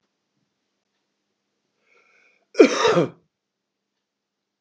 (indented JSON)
{
  "cough_length": "4.6 s",
  "cough_amplitude": 31034,
  "cough_signal_mean_std_ratio": 0.22,
  "survey_phase": "beta (2021-08-13 to 2022-03-07)",
  "age": "65+",
  "gender": "Male",
  "wearing_mask": "No",
  "symptom_none": true,
  "smoker_status": "Ex-smoker",
  "respiratory_condition_asthma": false,
  "respiratory_condition_other": false,
  "recruitment_source": "REACT",
  "submission_delay": "1 day",
  "covid_test_result": "Negative",
  "covid_test_method": "RT-qPCR",
  "influenza_a_test_result": "Negative",
  "influenza_b_test_result": "Negative"
}